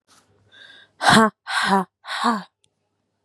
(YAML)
exhalation_length: 3.2 s
exhalation_amplitude: 30938
exhalation_signal_mean_std_ratio: 0.39
survey_phase: beta (2021-08-13 to 2022-03-07)
age: 18-44
gender: Female
wearing_mask: 'No'
symptom_cough_any: true
symptom_new_continuous_cough: true
symptom_runny_or_blocked_nose: true
symptom_shortness_of_breath: true
symptom_sore_throat: true
symptom_abdominal_pain: true
symptom_diarrhoea: true
symptom_fatigue: true
symptom_headache: true
symptom_change_to_sense_of_smell_or_taste: true
symptom_loss_of_taste: true
symptom_onset: 4 days
smoker_status: Never smoked
respiratory_condition_asthma: true
respiratory_condition_other: false
recruitment_source: Test and Trace
submission_delay: 1 day
covid_test_result: Positive
covid_test_method: RT-qPCR
covid_ct_value: 25.0
covid_ct_gene: ORF1ab gene